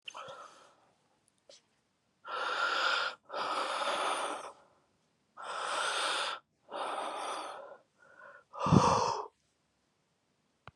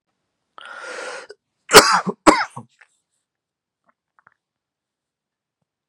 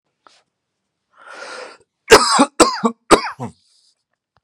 {"exhalation_length": "10.8 s", "exhalation_amplitude": 12312, "exhalation_signal_mean_std_ratio": 0.51, "three_cough_length": "5.9 s", "three_cough_amplitude": 32768, "three_cough_signal_mean_std_ratio": 0.22, "cough_length": "4.4 s", "cough_amplitude": 32768, "cough_signal_mean_std_ratio": 0.31, "survey_phase": "beta (2021-08-13 to 2022-03-07)", "age": "18-44", "gender": "Male", "wearing_mask": "No", "symptom_cough_any": true, "symptom_fatigue": true, "symptom_change_to_sense_of_smell_or_taste": true, "symptom_onset": "3 days", "smoker_status": "Never smoked", "respiratory_condition_asthma": false, "respiratory_condition_other": false, "recruitment_source": "Test and Trace", "submission_delay": "1 day", "covid_test_result": "Positive", "covid_test_method": "RT-qPCR", "covid_ct_value": 23.9, "covid_ct_gene": "N gene", "covid_ct_mean": 24.1, "covid_viral_load": "12000 copies/ml", "covid_viral_load_category": "Low viral load (10K-1M copies/ml)"}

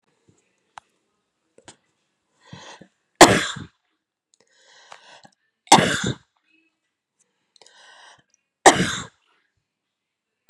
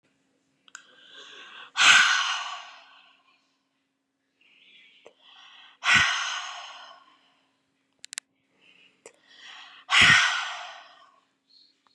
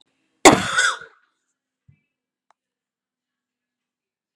{"three_cough_length": "10.5 s", "three_cough_amplitude": 32768, "three_cough_signal_mean_std_ratio": 0.2, "exhalation_length": "11.9 s", "exhalation_amplitude": 23000, "exhalation_signal_mean_std_ratio": 0.32, "cough_length": "4.4 s", "cough_amplitude": 32768, "cough_signal_mean_std_ratio": 0.2, "survey_phase": "beta (2021-08-13 to 2022-03-07)", "age": "45-64", "gender": "Female", "wearing_mask": "No", "symptom_none": true, "smoker_status": "Never smoked", "respiratory_condition_asthma": false, "respiratory_condition_other": false, "recruitment_source": "REACT", "submission_delay": "1 day", "covid_test_result": "Negative", "covid_test_method": "RT-qPCR", "influenza_a_test_result": "Negative", "influenza_b_test_result": "Negative"}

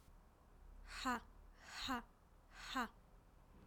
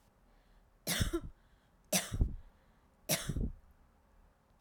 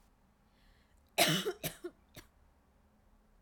{"exhalation_length": "3.7 s", "exhalation_amplitude": 1103, "exhalation_signal_mean_std_ratio": 0.52, "three_cough_length": "4.6 s", "three_cough_amplitude": 5773, "three_cough_signal_mean_std_ratio": 0.41, "cough_length": "3.4 s", "cough_amplitude": 7924, "cough_signal_mean_std_ratio": 0.3, "survey_phase": "beta (2021-08-13 to 2022-03-07)", "age": "18-44", "gender": "Female", "wearing_mask": "No", "symptom_none": true, "smoker_status": "Ex-smoker", "respiratory_condition_asthma": false, "respiratory_condition_other": false, "recruitment_source": "REACT", "submission_delay": "2 days", "covid_test_result": "Negative", "covid_test_method": "RT-qPCR"}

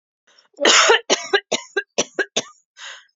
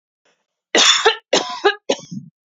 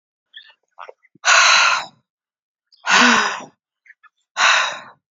{"cough_length": "3.2 s", "cough_amplitude": 32767, "cough_signal_mean_std_ratio": 0.41, "three_cough_length": "2.5 s", "three_cough_amplitude": 31636, "three_cough_signal_mean_std_ratio": 0.44, "exhalation_length": "5.1 s", "exhalation_amplitude": 30427, "exhalation_signal_mean_std_ratio": 0.44, "survey_phase": "beta (2021-08-13 to 2022-03-07)", "age": "18-44", "gender": "Female", "wearing_mask": "No", "symptom_none": true, "symptom_onset": "6 days", "smoker_status": "Never smoked", "respiratory_condition_asthma": false, "respiratory_condition_other": false, "recruitment_source": "REACT", "submission_delay": "1 day", "covid_test_result": "Negative", "covid_test_method": "RT-qPCR", "influenza_a_test_result": "Negative", "influenza_b_test_result": "Negative"}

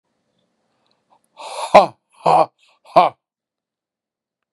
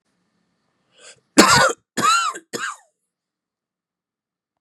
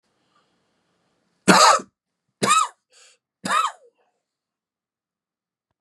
{"exhalation_length": "4.5 s", "exhalation_amplitude": 32768, "exhalation_signal_mean_std_ratio": 0.25, "cough_length": "4.6 s", "cough_amplitude": 32768, "cough_signal_mean_std_ratio": 0.32, "three_cough_length": "5.8 s", "three_cough_amplitude": 32640, "three_cough_signal_mean_std_ratio": 0.28, "survey_phase": "beta (2021-08-13 to 2022-03-07)", "age": "45-64", "gender": "Male", "wearing_mask": "No", "symptom_none": true, "smoker_status": "Ex-smoker", "respiratory_condition_asthma": false, "respiratory_condition_other": false, "recruitment_source": "REACT", "submission_delay": "1 day", "covid_test_result": "Negative", "covid_test_method": "RT-qPCR", "influenza_a_test_result": "Negative", "influenza_b_test_result": "Negative"}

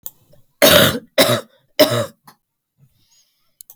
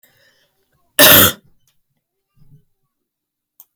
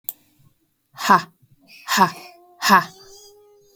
{"three_cough_length": "3.8 s", "three_cough_amplitude": 32768, "three_cough_signal_mean_std_ratio": 0.37, "cough_length": "3.8 s", "cough_amplitude": 32768, "cough_signal_mean_std_ratio": 0.25, "exhalation_length": "3.8 s", "exhalation_amplitude": 29888, "exhalation_signal_mean_std_ratio": 0.32, "survey_phase": "beta (2021-08-13 to 2022-03-07)", "age": "18-44", "gender": "Female", "wearing_mask": "No", "symptom_other": true, "smoker_status": "Ex-smoker", "respiratory_condition_asthma": true, "respiratory_condition_other": false, "recruitment_source": "Test and Trace", "submission_delay": "2 days", "covid_test_result": "Positive", "covid_test_method": "RT-qPCR", "covid_ct_value": 14.6, "covid_ct_gene": "ORF1ab gene"}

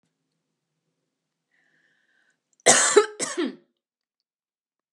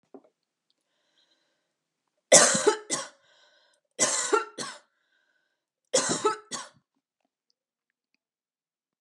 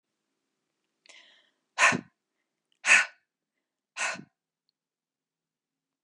{"cough_length": "4.9 s", "cough_amplitude": 31703, "cough_signal_mean_std_ratio": 0.25, "three_cough_length": "9.0 s", "three_cough_amplitude": 29407, "three_cough_signal_mean_std_ratio": 0.28, "exhalation_length": "6.0 s", "exhalation_amplitude": 15726, "exhalation_signal_mean_std_ratio": 0.22, "survey_phase": "beta (2021-08-13 to 2022-03-07)", "age": "18-44", "gender": "Female", "wearing_mask": "No", "symptom_none": true, "smoker_status": "Never smoked", "respiratory_condition_asthma": false, "respiratory_condition_other": false, "recruitment_source": "REACT", "submission_delay": "4 days", "covid_test_result": "Negative", "covid_test_method": "RT-qPCR", "influenza_a_test_result": "Negative", "influenza_b_test_result": "Negative"}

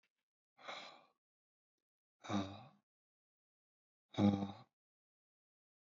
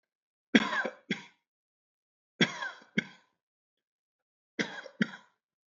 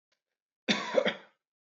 {"exhalation_length": "5.8 s", "exhalation_amplitude": 2832, "exhalation_signal_mean_std_ratio": 0.24, "three_cough_length": "5.7 s", "three_cough_amplitude": 13807, "three_cough_signal_mean_std_ratio": 0.26, "cough_length": "1.7 s", "cough_amplitude": 8133, "cough_signal_mean_std_ratio": 0.35, "survey_phase": "beta (2021-08-13 to 2022-03-07)", "age": "18-44", "gender": "Male", "wearing_mask": "No", "symptom_none": true, "smoker_status": "Never smoked", "respiratory_condition_asthma": false, "respiratory_condition_other": false, "recruitment_source": "REACT", "submission_delay": "3 days", "covid_test_result": "Negative", "covid_test_method": "RT-qPCR"}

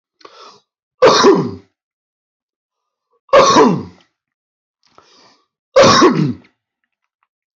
{"three_cough_length": "7.6 s", "three_cough_amplitude": 30548, "three_cough_signal_mean_std_ratio": 0.38, "survey_phase": "beta (2021-08-13 to 2022-03-07)", "age": "18-44", "gender": "Male", "wearing_mask": "No", "symptom_cough_any": true, "symptom_runny_or_blocked_nose": true, "symptom_sore_throat": true, "symptom_headache": true, "symptom_onset": "4 days", "smoker_status": "Never smoked", "respiratory_condition_asthma": false, "respiratory_condition_other": false, "recruitment_source": "Test and Trace", "submission_delay": "2 days", "covid_test_result": "Positive", "covid_test_method": "ePCR"}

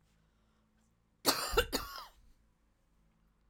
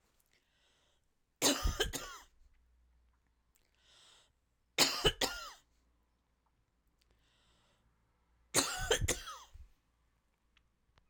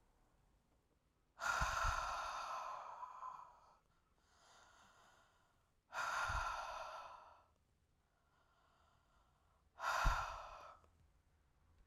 {"cough_length": "3.5 s", "cough_amplitude": 6521, "cough_signal_mean_std_ratio": 0.3, "three_cough_length": "11.1 s", "three_cough_amplitude": 7087, "three_cough_signal_mean_std_ratio": 0.3, "exhalation_length": "11.9 s", "exhalation_amplitude": 2250, "exhalation_signal_mean_std_ratio": 0.46, "survey_phase": "alpha (2021-03-01 to 2021-08-12)", "age": "45-64", "gender": "Female", "wearing_mask": "No", "symptom_none": true, "smoker_status": "Ex-smoker", "respiratory_condition_asthma": false, "respiratory_condition_other": false, "recruitment_source": "REACT", "submission_delay": "2 days", "covid_test_result": "Negative", "covid_test_method": "RT-qPCR"}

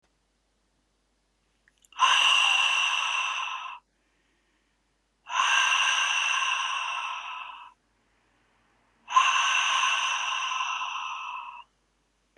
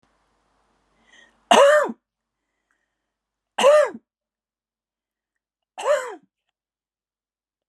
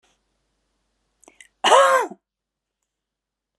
{"exhalation_length": "12.4 s", "exhalation_amplitude": 12439, "exhalation_signal_mean_std_ratio": 0.6, "three_cough_length": "7.7 s", "three_cough_amplitude": 30505, "three_cough_signal_mean_std_ratio": 0.28, "cough_length": "3.6 s", "cough_amplitude": 29692, "cough_signal_mean_std_ratio": 0.27, "survey_phase": "beta (2021-08-13 to 2022-03-07)", "age": "45-64", "gender": "Female", "wearing_mask": "No", "symptom_none": true, "smoker_status": "Never smoked", "respiratory_condition_asthma": false, "respiratory_condition_other": false, "recruitment_source": "REACT", "submission_delay": "2 days", "covid_test_result": "Negative", "covid_test_method": "RT-qPCR"}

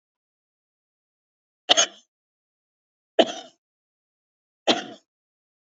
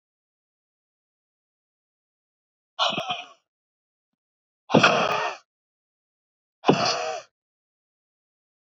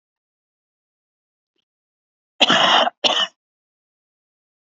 {"three_cough_length": "5.6 s", "three_cough_amplitude": 30201, "three_cough_signal_mean_std_ratio": 0.19, "exhalation_length": "8.6 s", "exhalation_amplitude": 27710, "exhalation_signal_mean_std_ratio": 0.29, "cough_length": "4.8 s", "cough_amplitude": 30878, "cough_signal_mean_std_ratio": 0.3, "survey_phase": "beta (2021-08-13 to 2022-03-07)", "age": "45-64", "gender": "Female", "wearing_mask": "No", "symptom_none": true, "smoker_status": "Current smoker (1 to 10 cigarettes per day)", "respiratory_condition_asthma": false, "respiratory_condition_other": false, "recruitment_source": "REACT", "submission_delay": "1 day", "covid_test_result": "Negative", "covid_test_method": "RT-qPCR", "influenza_a_test_result": "Negative", "influenza_b_test_result": "Negative"}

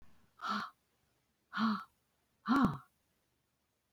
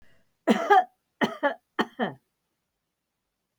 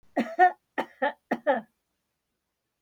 {"exhalation_length": "3.9 s", "exhalation_amplitude": 3808, "exhalation_signal_mean_std_ratio": 0.37, "cough_length": "3.6 s", "cough_amplitude": 16189, "cough_signal_mean_std_ratio": 0.32, "three_cough_length": "2.8 s", "three_cough_amplitude": 14862, "three_cough_signal_mean_std_ratio": 0.34, "survey_phase": "alpha (2021-03-01 to 2021-08-12)", "age": "65+", "gender": "Female", "wearing_mask": "No", "symptom_none": true, "smoker_status": "Ex-smoker", "respiratory_condition_asthma": false, "respiratory_condition_other": false, "recruitment_source": "REACT", "submission_delay": "1 day", "covid_test_result": "Negative", "covid_test_method": "RT-qPCR"}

